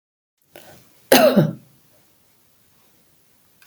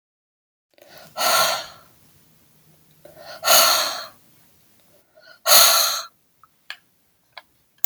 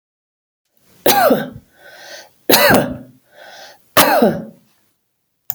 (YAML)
cough_length: 3.7 s
cough_amplitude: 32768
cough_signal_mean_std_ratio: 0.27
exhalation_length: 7.9 s
exhalation_amplitude: 32768
exhalation_signal_mean_std_ratio: 0.35
three_cough_length: 5.5 s
three_cough_amplitude: 32768
three_cough_signal_mean_std_ratio: 0.41
survey_phase: alpha (2021-03-01 to 2021-08-12)
age: 65+
gender: Female
wearing_mask: 'No'
symptom_none: true
smoker_status: Ex-smoker
respiratory_condition_asthma: false
respiratory_condition_other: false
recruitment_source: REACT
submission_delay: 2 days
covid_test_result: Negative
covid_test_method: RT-qPCR